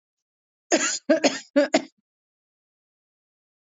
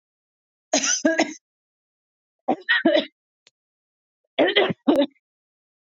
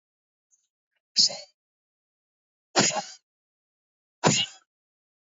{"cough_length": "3.7 s", "cough_amplitude": 18221, "cough_signal_mean_std_ratio": 0.32, "three_cough_length": "6.0 s", "three_cough_amplitude": 22363, "three_cough_signal_mean_std_ratio": 0.39, "exhalation_length": "5.2 s", "exhalation_amplitude": 17575, "exhalation_signal_mean_std_ratio": 0.27, "survey_phase": "beta (2021-08-13 to 2022-03-07)", "age": "45-64", "gender": "Female", "wearing_mask": "No", "symptom_runny_or_blocked_nose": true, "symptom_shortness_of_breath": true, "symptom_sore_throat": true, "symptom_fatigue": true, "symptom_headache": true, "symptom_change_to_sense_of_smell_or_taste": true, "symptom_onset": "2 days", "smoker_status": "Ex-smoker", "respiratory_condition_asthma": true, "respiratory_condition_other": false, "recruitment_source": "Test and Trace", "submission_delay": "2 days", "covid_test_result": "Positive", "covid_test_method": "RT-qPCR", "covid_ct_value": 29.3, "covid_ct_gene": "N gene"}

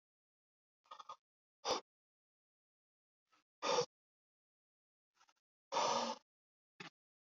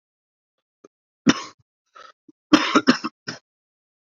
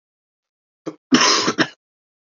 {"exhalation_length": "7.3 s", "exhalation_amplitude": 2255, "exhalation_signal_mean_std_ratio": 0.27, "three_cough_length": "4.1 s", "three_cough_amplitude": 29799, "three_cough_signal_mean_std_ratio": 0.25, "cough_length": "2.2 s", "cough_amplitude": 30847, "cough_signal_mean_std_ratio": 0.37, "survey_phase": "beta (2021-08-13 to 2022-03-07)", "age": "18-44", "gender": "Male", "wearing_mask": "No", "symptom_cough_any": true, "symptom_runny_or_blocked_nose": true, "symptom_abdominal_pain": true, "symptom_fever_high_temperature": true, "symptom_headache": true, "symptom_change_to_sense_of_smell_or_taste": true, "symptom_loss_of_taste": true, "symptom_onset": "3 days", "smoker_status": "Current smoker (1 to 10 cigarettes per day)", "respiratory_condition_asthma": false, "respiratory_condition_other": false, "recruitment_source": "Test and Trace", "submission_delay": "3 days", "covid_test_method": "RT-qPCR"}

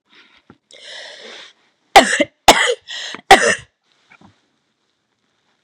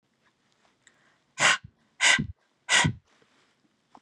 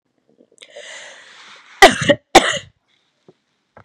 {"three_cough_length": "5.6 s", "three_cough_amplitude": 32768, "three_cough_signal_mean_std_ratio": 0.28, "exhalation_length": "4.0 s", "exhalation_amplitude": 15882, "exhalation_signal_mean_std_ratio": 0.32, "cough_length": "3.8 s", "cough_amplitude": 32768, "cough_signal_mean_std_ratio": 0.25, "survey_phase": "beta (2021-08-13 to 2022-03-07)", "age": "45-64", "gender": "Female", "wearing_mask": "No", "symptom_none": true, "smoker_status": "Current smoker (1 to 10 cigarettes per day)", "respiratory_condition_asthma": false, "respiratory_condition_other": false, "recruitment_source": "REACT", "submission_delay": "1 day", "covid_test_result": "Negative", "covid_test_method": "RT-qPCR", "influenza_a_test_result": "Negative", "influenza_b_test_result": "Negative"}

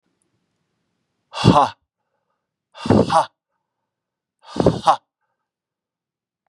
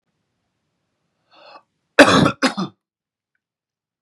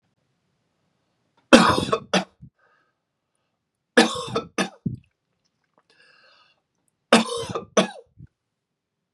{"exhalation_length": "6.5 s", "exhalation_amplitude": 31937, "exhalation_signal_mean_std_ratio": 0.28, "cough_length": "4.0 s", "cough_amplitude": 32768, "cough_signal_mean_std_ratio": 0.25, "three_cough_length": "9.1 s", "three_cough_amplitude": 32767, "three_cough_signal_mean_std_ratio": 0.27, "survey_phase": "beta (2021-08-13 to 2022-03-07)", "age": "18-44", "gender": "Male", "wearing_mask": "No", "symptom_cough_any": true, "symptom_runny_or_blocked_nose": true, "symptom_shortness_of_breath": true, "symptom_fatigue": true, "symptom_headache": true, "symptom_onset": "3 days", "smoker_status": "Never smoked", "respiratory_condition_asthma": false, "respiratory_condition_other": false, "recruitment_source": "Test and Trace", "submission_delay": "2 days", "covid_test_result": "Positive", "covid_test_method": "LAMP"}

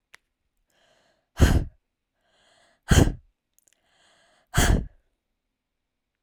{"exhalation_length": "6.2 s", "exhalation_amplitude": 21281, "exhalation_signal_mean_std_ratio": 0.27, "survey_phase": "alpha (2021-03-01 to 2021-08-12)", "age": "18-44", "gender": "Female", "wearing_mask": "No", "symptom_none": true, "symptom_onset": "4 days", "smoker_status": "Never smoked", "respiratory_condition_asthma": false, "respiratory_condition_other": false, "recruitment_source": "REACT", "submission_delay": "2 days", "covid_test_result": "Negative", "covid_test_method": "RT-qPCR"}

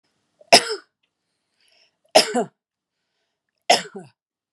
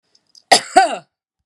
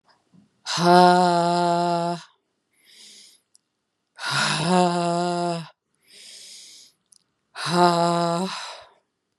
{"three_cough_length": "4.5 s", "three_cough_amplitude": 32768, "three_cough_signal_mean_std_ratio": 0.23, "cough_length": "1.5 s", "cough_amplitude": 32768, "cough_signal_mean_std_ratio": 0.33, "exhalation_length": "9.4 s", "exhalation_amplitude": 27937, "exhalation_signal_mean_std_ratio": 0.48, "survey_phase": "beta (2021-08-13 to 2022-03-07)", "age": "45-64", "gender": "Female", "wearing_mask": "No", "symptom_none": true, "smoker_status": "Ex-smoker", "respiratory_condition_asthma": false, "respiratory_condition_other": false, "recruitment_source": "REACT", "submission_delay": "0 days", "covid_test_result": "Negative", "covid_test_method": "RT-qPCR"}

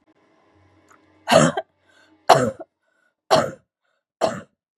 {"three_cough_length": "4.8 s", "three_cough_amplitude": 32767, "three_cough_signal_mean_std_ratio": 0.3, "survey_phase": "beta (2021-08-13 to 2022-03-07)", "age": "18-44", "gender": "Female", "wearing_mask": "No", "symptom_runny_or_blocked_nose": true, "symptom_sore_throat": true, "symptom_headache": true, "smoker_status": "Never smoked", "respiratory_condition_asthma": false, "respiratory_condition_other": false, "recruitment_source": "Test and Trace", "submission_delay": "1 day", "covid_test_result": "Positive", "covid_test_method": "RT-qPCR", "covid_ct_value": 17.5, "covid_ct_gene": "ORF1ab gene", "covid_ct_mean": 18.9, "covid_viral_load": "620000 copies/ml", "covid_viral_load_category": "Low viral load (10K-1M copies/ml)"}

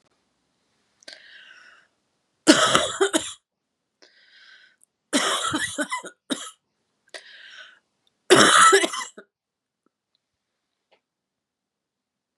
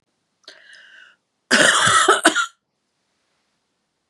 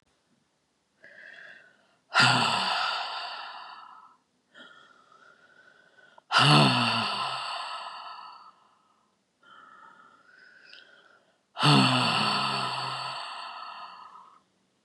{"three_cough_length": "12.4 s", "three_cough_amplitude": 32744, "three_cough_signal_mean_std_ratio": 0.3, "cough_length": "4.1 s", "cough_amplitude": 32559, "cough_signal_mean_std_ratio": 0.38, "exhalation_length": "14.8 s", "exhalation_amplitude": 14638, "exhalation_signal_mean_std_ratio": 0.44, "survey_phase": "beta (2021-08-13 to 2022-03-07)", "age": "45-64", "gender": "Female", "wearing_mask": "No", "symptom_cough_any": true, "symptom_new_continuous_cough": true, "symptom_runny_or_blocked_nose": true, "symptom_fatigue": true, "symptom_onset": "5 days", "smoker_status": "Ex-smoker", "respiratory_condition_asthma": false, "respiratory_condition_other": false, "recruitment_source": "Test and Trace", "submission_delay": "1 day", "covid_test_result": "Positive", "covid_test_method": "ePCR"}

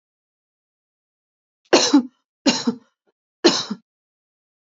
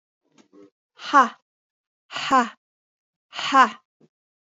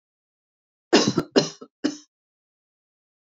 {"three_cough_length": "4.7 s", "three_cough_amplitude": 32767, "three_cough_signal_mean_std_ratio": 0.28, "exhalation_length": "4.5 s", "exhalation_amplitude": 25042, "exhalation_signal_mean_std_ratio": 0.28, "cough_length": "3.2 s", "cough_amplitude": 26182, "cough_signal_mean_std_ratio": 0.27, "survey_phase": "alpha (2021-03-01 to 2021-08-12)", "age": "45-64", "gender": "Female", "wearing_mask": "No", "symptom_none": true, "smoker_status": "Never smoked", "respiratory_condition_asthma": false, "respiratory_condition_other": false, "recruitment_source": "REACT", "submission_delay": "1 day", "covid_test_result": "Negative", "covid_test_method": "RT-qPCR"}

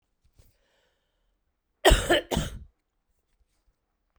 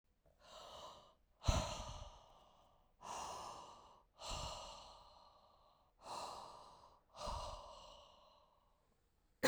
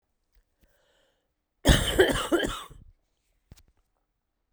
{"cough_length": "4.2 s", "cough_amplitude": 25507, "cough_signal_mean_std_ratio": 0.25, "exhalation_length": "9.5 s", "exhalation_amplitude": 2921, "exhalation_signal_mean_std_ratio": 0.42, "three_cough_length": "4.5 s", "three_cough_amplitude": 19679, "three_cough_signal_mean_std_ratio": 0.31, "survey_phase": "beta (2021-08-13 to 2022-03-07)", "age": "45-64", "gender": "Female", "wearing_mask": "No", "symptom_cough_any": true, "symptom_runny_or_blocked_nose": true, "symptom_headache": true, "symptom_loss_of_taste": true, "symptom_onset": "4 days", "smoker_status": "Ex-smoker", "respiratory_condition_asthma": false, "respiratory_condition_other": false, "recruitment_source": "Test and Trace", "submission_delay": "2 days", "covid_test_result": "Positive", "covid_test_method": "RT-qPCR", "covid_ct_value": 22.2, "covid_ct_gene": "ORF1ab gene"}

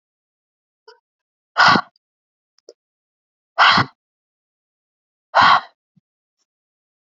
{"exhalation_length": "7.2 s", "exhalation_amplitude": 32768, "exhalation_signal_mean_std_ratio": 0.26, "survey_phase": "beta (2021-08-13 to 2022-03-07)", "age": "18-44", "gender": "Female", "wearing_mask": "No", "symptom_sore_throat": true, "symptom_onset": "8 days", "smoker_status": "Current smoker (e-cigarettes or vapes only)", "respiratory_condition_asthma": false, "respiratory_condition_other": false, "recruitment_source": "REACT", "submission_delay": "18 days", "covid_test_result": "Negative", "covid_test_method": "RT-qPCR", "influenza_a_test_result": "Negative", "influenza_b_test_result": "Negative"}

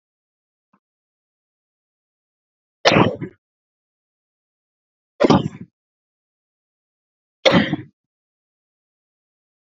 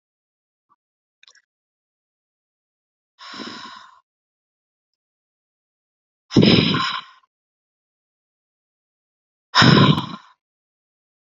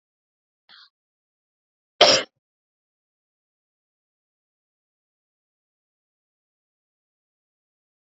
{"three_cough_length": "9.7 s", "three_cough_amplitude": 29636, "three_cough_signal_mean_std_ratio": 0.22, "exhalation_length": "11.3 s", "exhalation_amplitude": 28859, "exhalation_signal_mean_std_ratio": 0.25, "cough_length": "8.1 s", "cough_amplitude": 27781, "cough_signal_mean_std_ratio": 0.12, "survey_phase": "beta (2021-08-13 to 2022-03-07)", "age": "18-44", "gender": "Female", "wearing_mask": "No", "symptom_none": true, "smoker_status": "Never smoked", "respiratory_condition_asthma": false, "respiratory_condition_other": false, "recruitment_source": "REACT", "submission_delay": "4 days", "covid_test_result": "Negative", "covid_test_method": "RT-qPCR", "influenza_a_test_result": "Negative", "influenza_b_test_result": "Negative"}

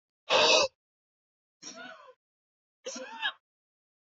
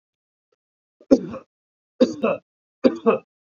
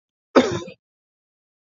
{"exhalation_length": "4.1 s", "exhalation_amplitude": 10994, "exhalation_signal_mean_std_ratio": 0.31, "three_cough_length": "3.6 s", "three_cough_amplitude": 27360, "three_cough_signal_mean_std_ratio": 0.29, "cough_length": "1.7 s", "cough_amplitude": 27725, "cough_signal_mean_std_ratio": 0.25, "survey_phase": "beta (2021-08-13 to 2022-03-07)", "age": "45-64", "gender": "Male", "wearing_mask": "No", "symptom_cough_any": true, "symptom_runny_or_blocked_nose": true, "symptom_fatigue": true, "symptom_headache": true, "symptom_change_to_sense_of_smell_or_taste": true, "symptom_onset": "4 days", "smoker_status": "Never smoked", "respiratory_condition_asthma": false, "respiratory_condition_other": false, "recruitment_source": "Test and Trace", "submission_delay": "2 days", "covid_test_result": "Positive", "covid_test_method": "RT-qPCR"}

